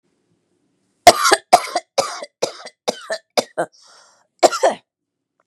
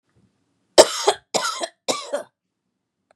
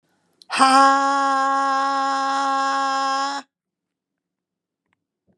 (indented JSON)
{
  "cough_length": "5.5 s",
  "cough_amplitude": 32768,
  "cough_signal_mean_std_ratio": 0.3,
  "three_cough_length": "3.2 s",
  "three_cough_amplitude": 32768,
  "three_cough_signal_mean_std_ratio": 0.28,
  "exhalation_length": "5.4 s",
  "exhalation_amplitude": 30329,
  "exhalation_signal_mean_std_ratio": 0.57,
  "survey_phase": "beta (2021-08-13 to 2022-03-07)",
  "age": "45-64",
  "gender": "Female",
  "wearing_mask": "No",
  "symptom_none": true,
  "smoker_status": "Never smoked",
  "respiratory_condition_asthma": false,
  "respiratory_condition_other": false,
  "recruitment_source": "REACT",
  "submission_delay": "2 days",
  "covid_test_result": "Negative",
  "covid_test_method": "RT-qPCR",
  "influenza_a_test_result": "Negative",
  "influenza_b_test_result": "Negative"
}